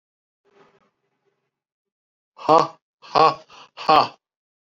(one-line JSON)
{"exhalation_length": "4.8 s", "exhalation_amplitude": 32718, "exhalation_signal_mean_std_ratio": 0.25, "survey_phase": "alpha (2021-03-01 to 2021-08-12)", "age": "45-64", "gender": "Male", "wearing_mask": "No", "symptom_cough_any": true, "smoker_status": "Never smoked", "respiratory_condition_asthma": false, "respiratory_condition_other": false, "recruitment_source": "Test and Trace", "submission_delay": "1 day", "covid_test_result": "Positive", "covid_test_method": "RT-qPCR", "covid_ct_value": 16.3, "covid_ct_gene": "ORF1ab gene", "covid_ct_mean": 16.5, "covid_viral_load": "3900000 copies/ml", "covid_viral_load_category": "High viral load (>1M copies/ml)"}